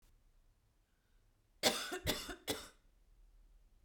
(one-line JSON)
{"cough_length": "3.8 s", "cough_amplitude": 5004, "cough_signal_mean_std_ratio": 0.35, "survey_phase": "beta (2021-08-13 to 2022-03-07)", "age": "18-44", "gender": "Female", "wearing_mask": "No", "symptom_cough_any": true, "smoker_status": "Ex-smoker", "respiratory_condition_asthma": false, "respiratory_condition_other": false, "recruitment_source": "Test and Trace", "submission_delay": "1 day", "covid_test_result": "Negative", "covid_test_method": "RT-qPCR"}